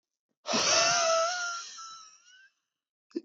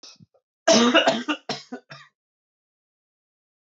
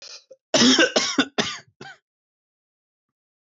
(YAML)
exhalation_length: 3.2 s
exhalation_amplitude: 7472
exhalation_signal_mean_std_ratio: 0.55
three_cough_length: 3.8 s
three_cough_amplitude: 19701
three_cough_signal_mean_std_ratio: 0.34
cough_length: 3.4 s
cough_amplitude: 19742
cough_signal_mean_std_ratio: 0.37
survey_phase: beta (2021-08-13 to 2022-03-07)
age: 18-44
gender: Male
wearing_mask: 'No'
symptom_none: true
smoker_status: Never smoked
respiratory_condition_asthma: true
respiratory_condition_other: false
recruitment_source: REACT
submission_delay: 0 days
covid_test_result: Negative
covid_test_method: RT-qPCR